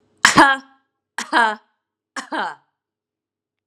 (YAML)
three_cough_length: 3.7 s
three_cough_amplitude: 32768
three_cough_signal_mean_std_ratio: 0.31
survey_phase: beta (2021-08-13 to 2022-03-07)
age: 18-44
gender: Female
wearing_mask: 'No'
symptom_headache: true
symptom_onset: 2 days
smoker_status: Never smoked
respiratory_condition_asthma: false
respiratory_condition_other: false
recruitment_source: Test and Trace
submission_delay: 2 days
covid_test_result: Positive
covid_test_method: RT-qPCR
covid_ct_value: 32.4
covid_ct_gene: ORF1ab gene
covid_ct_mean: 33.3
covid_viral_load: 12 copies/ml
covid_viral_load_category: Minimal viral load (< 10K copies/ml)